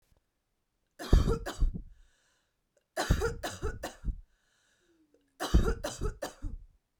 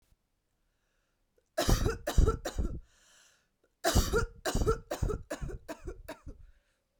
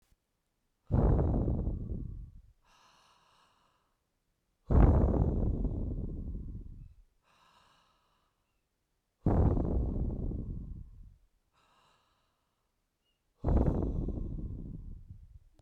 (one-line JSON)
{"three_cough_length": "7.0 s", "three_cough_amplitude": 12295, "three_cough_signal_mean_std_ratio": 0.39, "cough_length": "7.0 s", "cough_amplitude": 7978, "cough_signal_mean_std_ratio": 0.43, "exhalation_length": "15.6 s", "exhalation_amplitude": 10281, "exhalation_signal_mean_std_ratio": 0.48, "survey_phase": "beta (2021-08-13 to 2022-03-07)", "age": "18-44", "gender": "Female", "wearing_mask": "No", "symptom_none": true, "smoker_status": "Current smoker (1 to 10 cigarettes per day)", "respiratory_condition_asthma": false, "respiratory_condition_other": false, "recruitment_source": "REACT", "submission_delay": "3 days", "covid_test_result": "Negative", "covid_test_method": "RT-qPCR", "influenza_a_test_result": "Negative", "influenza_b_test_result": "Negative"}